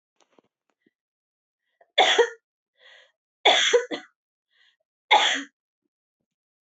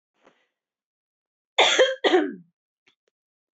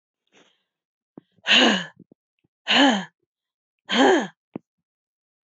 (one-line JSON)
{"three_cough_length": "6.7 s", "three_cough_amplitude": 19403, "three_cough_signal_mean_std_ratio": 0.3, "cough_length": "3.6 s", "cough_amplitude": 21358, "cough_signal_mean_std_ratio": 0.32, "exhalation_length": "5.5 s", "exhalation_amplitude": 20602, "exhalation_signal_mean_std_ratio": 0.35, "survey_phase": "beta (2021-08-13 to 2022-03-07)", "age": "45-64", "gender": "Female", "wearing_mask": "No", "symptom_cough_any": true, "symptom_runny_or_blocked_nose": true, "symptom_sore_throat": true, "symptom_fatigue": true, "symptom_fever_high_temperature": true, "symptom_onset": "4 days", "smoker_status": "Never smoked", "respiratory_condition_asthma": true, "respiratory_condition_other": false, "recruitment_source": "Test and Trace", "submission_delay": "2 days", "covid_test_result": "Positive", "covid_test_method": "RT-qPCR"}